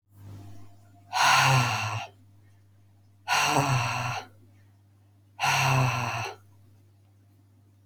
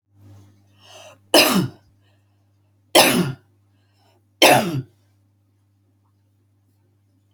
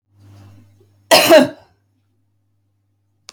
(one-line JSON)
{"exhalation_length": "7.9 s", "exhalation_amplitude": 12646, "exhalation_signal_mean_std_ratio": 0.52, "three_cough_length": "7.3 s", "three_cough_amplitude": 32768, "three_cough_signal_mean_std_ratio": 0.3, "cough_length": "3.3 s", "cough_amplitude": 32768, "cough_signal_mean_std_ratio": 0.28, "survey_phase": "beta (2021-08-13 to 2022-03-07)", "age": "45-64", "gender": "Female", "wearing_mask": "No", "symptom_none": true, "smoker_status": "Never smoked", "respiratory_condition_asthma": false, "respiratory_condition_other": false, "recruitment_source": "REACT", "submission_delay": "2 days", "covid_test_result": "Negative", "covid_test_method": "RT-qPCR"}